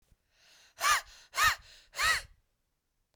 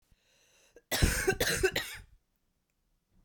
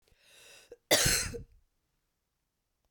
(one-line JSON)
{"exhalation_length": "3.2 s", "exhalation_amplitude": 7510, "exhalation_signal_mean_std_ratio": 0.38, "three_cough_length": "3.2 s", "three_cough_amplitude": 9437, "three_cough_signal_mean_std_ratio": 0.41, "cough_length": "2.9 s", "cough_amplitude": 10483, "cough_signal_mean_std_ratio": 0.31, "survey_phase": "beta (2021-08-13 to 2022-03-07)", "age": "18-44", "gender": "Female", "wearing_mask": "No", "symptom_cough_any": true, "symptom_fatigue": true, "symptom_headache": true, "symptom_other": true, "smoker_status": "Ex-smoker", "respiratory_condition_asthma": true, "respiratory_condition_other": false, "recruitment_source": "Test and Trace", "submission_delay": "1 day", "covid_test_result": "Positive", "covid_test_method": "RT-qPCR", "covid_ct_value": 28.3, "covid_ct_gene": "ORF1ab gene", "covid_ct_mean": 29.1, "covid_viral_load": "280 copies/ml", "covid_viral_load_category": "Minimal viral load (< 10K copies/ml)"}